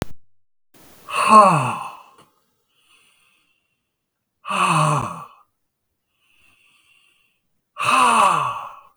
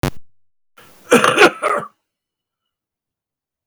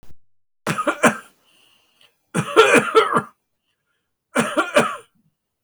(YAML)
exhalation_length: 9.0 s
exhalation_amplitude: 32768
exhalation_signal_mean_std_ratio: 0.39
cough_length: 3.7 s
cough_amplitude: 32768
cough_signal_mean_std_ratio: 0.33
three_cough_length: 5.6 s
three_cough_amplitude: 32497
three_cough_signal_mean_std_ratio: 0.4
survey_phase: beta (2021-08-13 to 2022-03-07)
age: 65+
gender: Male
wearing_mask: 'No'
symptom_cough_any: true
symptom_runny_or_blocked_nose: true
symptom_sore_throat: true
symptom_fatigue: true
smoker_status: Ex-smoker
respiratory_condition_asthma: false
respiratory_condition_other: false
recruitment_source: Test and Trace
submission_delay: 1 day
covid_test_result: Positive
covid_test_method: RT-qPCR
covid_ct_value: 23.2
covid_ct_gene: ORF1ab gene